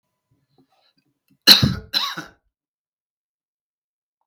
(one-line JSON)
{"cough_length": "4.3 s", "cough_amplitude": 32768, "cough_signal_mean_std_ratio": 0.21, "survey_phase": "beta (2021-08-13 to 2022-03-07)", "age": "45-64", "gender": "Male", "wearing_mask": "No", "symptom_runny_or_blocked_nose": true, "symptom_headache": true, "smoker_status": "Never smoked", "respiratory_condition_asthma": false, "respiratory_condition_other": false, "recruitment_source": "REACT", "submission_delay": "3 days", "covid_test_result": "Negative", "covid_test_method": "RT-qPCR"}